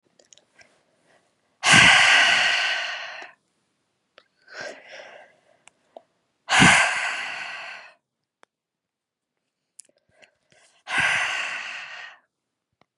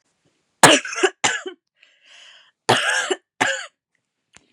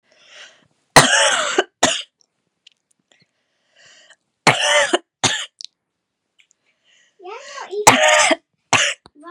{"exhalation_length": "13.0 s", "exhalation_amplitude": 27921, "exhalation_signal_mean_std_ratio": 0.37, "cough_length": "4.5 s", "cough_amplitude": 32768, "cough_signal_mean_std_ratio": 0.35, "three_cough_length": "9.3 s", "three_cough_amplitude": 32768, "three_cough_signal_mean_std_ratio": 0.38, "survey_phase": "beta (2021-08-13 to 2022-03-07)", "age": "18-44", "gender": "Female", "wearing_mask": "No", "symptom_headache": true, "symptom_onset": "13 days", "smoker_status": "Ex-smoker", "respiratory_condition_asthma": false, "respiratory_condition_other": false, "recruitment_source": "REACT", "submission_delay": "9 days", "covid_test_result": "Negative", "covid_test_method": "RT-qPCR", "influenza_a_test_result": "Negative", "influenza_b_test_result": "Negative"}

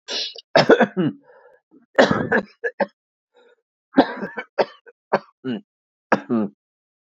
{"three_cough_length": "7.2 s", "three_cough_amplitude": 28441, "three_cough_signal_mean_std_ratio": 0.36, "survey_phase": "beta (2021-08-13 to 2022-03-07)", "age": "45-64", "gender": "Female", "wearing_mask": "No", "symptom_runny_or_blocked_nose": true, "smoker_status": "Ex-smoker", "respiratory_condition_asthma": false, "respiratory_condition_other": false, "recruitment_source": "Test and Trace", "submission_delay": "3 days", "covid_test_result": "Positive", "covid_test_method": "ePCR"}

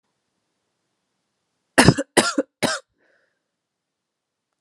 {"cough_length": "4.6 s", "cough_amplitude": 32768, "cough_signal_mean_std_ratio": 0.23, "survey_phase": "alpha (2021-03-01 to 2021-08-12)", "age": "18-44", "gender": "Female", "wearing_mask": "No", "symptom_cough_any": true, "symptom_fatigue": true, "symptom_change_to_sense_of_smell_or_taste": true, "symptom_loss_of_taste": true, "symptom_onset": "3 days", "smoker_status": "Never smoked", "respiratory_condition_asthma": false, "respiratory_condition_other": false, "recruitment_source": "Test and Trace", "submission_delay": "2 days", "covid_test_result": "Positive", "covid_test_method": "RT-qPCR", "covid_ct_value": 19.6, "covid_ct_gene": "S gene", "covid_ct_mean": 20.9, "covid_viral_load": "140000 copies/ml", "covid_viral_load_category": "Low viral load (10K-1M copies/ml)"}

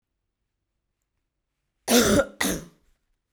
{"cough_length": "3.3 s", "cough_amplitude": 18413, "cough_signal_mean_std_ratio": 0.32, "survey_phase": "beta (2021-08-13 to 2022-03-07)", "age": "18-44", "gender": "Female", "wearing_mask": "No", "symptom_cough_any": true, "symptom_shortness_of_breath": true, "symptom_sore_throat": true, "symptom_fatigue": true, "symptom_headache": true, "smoker_status": "Current smoker (1 to 10 cigarettes per day)", "respiratory_condition_asthma": false, "respiratory_condition_other": false, "recruitment_source": "Test and Trace", "submission_delay": "1 day", "covid_test_result": "Positive", "covid_test_method": "RT-qPCR", "covid_ct_value": 22.1, "covid_ct_gene": "ORF1ab gene", "covid_ct_mean": 22.6, "covid_viral_load": "38000 copies/ml", "covid_viral_load_category": "Low viral load (10K-1M copies/ml)"}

